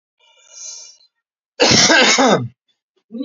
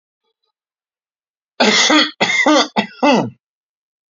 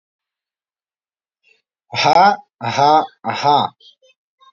cough_length: 3.2 s
cough_amplitude: 32768
cough_signal_mean_std_ratio: 0.46
three_cough_length: 4.1 s
three_cough_amplitude: 29750
three_cough_signal_mean_std_ratio: 0.46
exhalation_length: 4.5 s
exhalation_amplitude: 28727
exhalation_signal_mean_std_ratio: 0.4
survey_phase: beta (2021-08-13 to 2022-03-07)
age: 18-44
gender: Male
wearing_mask: 'No'
symptom_none: true
smoker_status: Never smoked
respiratory_condition_asthma: false
respiratory_condition_other: false
recruitment_source: REACT
submission_delay: 0 days
covid_test_result: Negative
covid_test_method: RT-qPCR
influenza_a_test_result: Negative
influenza_b_test_result: Negative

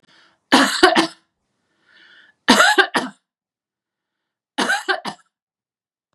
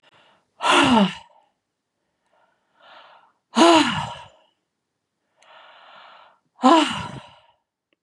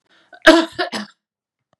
three_cough_length: 6.1 s
three_cough_amplitude: 32767
three_cough_signal_mean_std_ratio: 0.35
exhalation_length: 8.0 s
exhalation_amplitude: 28096
exhalation_signal_mean_std_ratio: 0.33
cough_length: 1.8 s
cough_amplitude: 32768
cough_signal_mean_std_ratio: 0.31
survey_phase: beta (2021-08-13 to 2022-03-07)
age: 65+
gender: Female
wearing_mask: 'No'
symptom_none: true
smoker_status: Ex-smoker
respiratory_condition_asthma: false
respiratory_condition_other: false
recruitment_source: REACT
submission_delay: 2 days
covid_test_result: Negative
covid_test_method: RT-qPCR
influenza_a_test_result: Negative
influenza_b_test_result: Negative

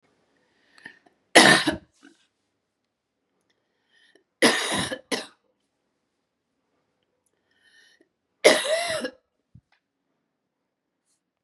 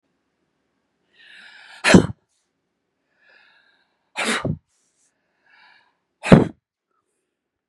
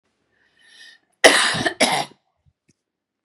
three_cough_length: 11.4 s
three_cough_amplitude: 31926
three_cough_signal_mean_std_ratio: 0.24
exhalation_length: 7.7 s
exhalation_amplitude: 32768
exhalation_signal_mean_std_ratio: 0.2
cough_length: 3.2 s
cough_amplitude: 32768
cough_signal_mean_std_ratio: 0.33
survey_phase: beta (2021-08-13 to 2022-03-07)
age: 45-64
gender: Female
wearing_mask: 'No'
symptom_runny_or_blocked_nose: true
smoker_status: Ex-smoker
respiratory_condition_asthma: true
respiratory_condition_other: false
recruitment_source: REACT
submission_delay: 1 day
covid_test_result: Negative
covid_test_method: RT-qPCR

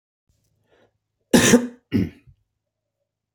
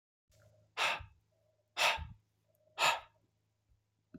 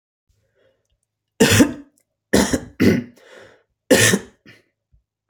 cough_length: 3.3 s
cough_amplitude: 27839
cough_signal_mean_std_ratio: 0.28
exhalation_length: 4.2 s
exhalation_amplitude: 4458
exhalation_signal_mean_std_ratio: 0.33
three_cough_length: 5.3 s
three_cough_amplitude: 29140
three_cough_signal_mean_std_ratio: 0.36
survey_phase: beta (2021-08-13 to 2022-03-07)
age: 18-44
gender: Male
wearing_mask: 'No'
symptom_none: true
smoker_status: Never smoked
respiratory_condition_asthma: false
respiratory_condition_other: false
recruitment_source: REACT
submission_delay: 1 day
covid_test_result: Negative
covid_test_method: RT-qPCR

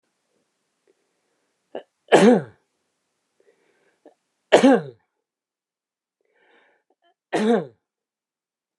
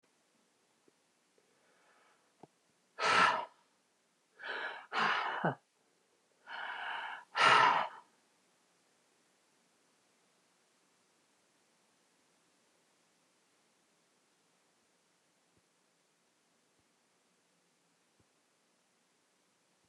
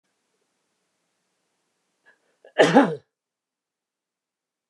three_cough_length: 8.8 s
three_cough_amplitude: 29204
three_cough_signal_mean_std_ratio: 0.24
exhalation_length: 19.9 s
exhalation_amplitude: 6607
exhalation_signal_mean_std_ratio: 0.25
cough_length: 4.7 s
cough_amplitude: 27113
cough_signal_mean_std_ratio: 0.2
survey_phase: beta (2021-08-13 to 2022-03-07)
age: 65+
gender: Male
wearing_mask: 'No'
symptom_cough_any: true
smoker_status: Ex-smoker
respiratory_condition_asthma: false
respiratory_condition_other: false
recruitment_source: REACT
submission_delay: 3 days
covid_test_result: Negative
covid_test_method: RT-qPCR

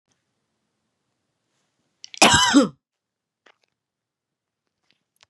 cough_length: 5.3 s
cough_amplitude: 31747
cough_signal_mean_std_ratio: 0.23
survey_phase: beta (2021-08-13 to 2022-03-07)
age: 45-64
gender: Female
wearing_mask: 'No'
symptom_none: true
smoker_status: Never smoked
respiratory_condition_asthma: false
respiratory_condition_other: false
recruitment_source: REACT
submission_delay: 4 days
covid_test_result: Negative
covid_test_method: RT-qPCR
influenza_a_test_result: Negative
influenza_b_test_result: Negative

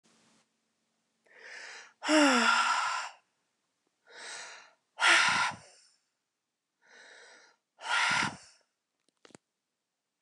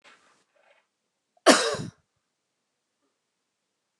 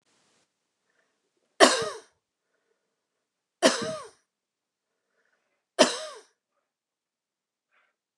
exhalation_length: 10.2 s
exhalation_amplitude: 10318
exhalation_signal_mean_std_ratio: 0.38
cough_length: 4.0 s
cough_amplitude: 28699
cough_signal_mean_std_ratio: 0.19
three_cough_length: 8.2 s
three_cough_amplitude: 29203
three_cough_signal_mean_std_ratio: 0.2
survey_phase: beta (2021-08-13 to 2022-03-07)
age: 65+
gender: Female
wearing_mask: 'No'
symptom_none: true
smoker_status: Never smoked
respiratory_condition_asthma: false
respiratory_condition_other: false
recruitment_source: REACT
submission_delay: 2 days
covid_test_result: Negative
covid_test_method: RT-qPCR
influenza_a_test_result: Negative
influenza_b_test_result: Negative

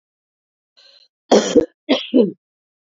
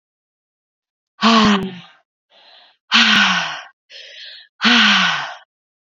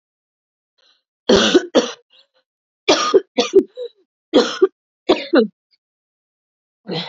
cough_length: 3.0 s
cough_amplitude: 31218
cough_signal_mean_std_ratio: 0.33
exhalation_length: 6.0 s
exhalation_amplitude: 31498
exhalation_signal_mean_std_ratio: 0.46
three_cough_length: 7.1 s
three_cough_amplitude: 28327
three_cough_signal_mean_std_ratio: 0.36
survey_phase: beta (2021-08-13 to 2022-03-07)
age: 18-44
gender: Female
wearing_mask: 'No'
symptom_cough_any: true
symptom_runny_or_blocked_nose: true
symptom_shortness_of_breath: true
symptom_sore_throat: true
symptom_fatigue: true
symptom_fever_high_temperature: true
symptom_headache: true
symptom_change_to_sense_of_smell_or_taste: true
symptom_other: true
symptom_onset: 6 days
smoker_status: Ex-smoker
respiratory_condition_asthma: false
respiratory_condition_other: false
recruitment_source: Test and Trace
submission_delay: 2 days
covid_test_result: Positive
covid_test_method: RT-qPCR
covid_ct_value: 15.9
covid_ct_gene: ORF1ab gene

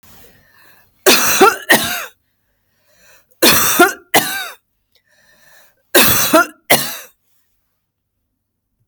three_cough_length: 8.9 s
three_cough_amplitude: 32768
three_cough_signal_mean_std_ratio: 0.4
survey_phase: beta (2021-08-13 to 2022-03-07)
age: 45-64
gender: Female
wearing_mask: 'No'
symptom_none: true
smoker_status: Never smoked
respiratory_condition_asthma: false
respiratory_condition_other: false
recruitment_source: Test and Trace
submission_delay: 1 day
covid_test_result: Negative
covid_test_method: LFT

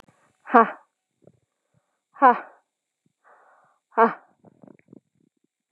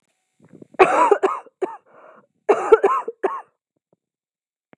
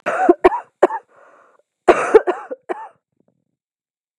exhalation_length: 5.7 s
exhalation_amplitude: 30057
exhalation_signal_mean_std_ratio: 0.2
three_cough_length: 4.8 s
three_cough_amplitude: 32768
three_cough_signal_mean_std_ratio: 0.35
cough_length: 4.2 s
cough_amplitude: 32768
cough_signal_mean_std_ratio: 0.32
survey_phase: beta (2021-08-13 to 2022-03-07)
age: 18-44
gender: Female
wearing_mask: 'No'
symptom_new_continuous_cough: true
symptom_sore_throat: true
symptom_fatigue: true
symptom_onset: 10 days
smoker_status: Ex-smoker
respiratory_condition_asthma: false
respiratory_condition_other: false
recruitment_source: Test and Trace
submission_delay: 2 days
covid_test_result: Negative
covid_test_method: RT-qPCR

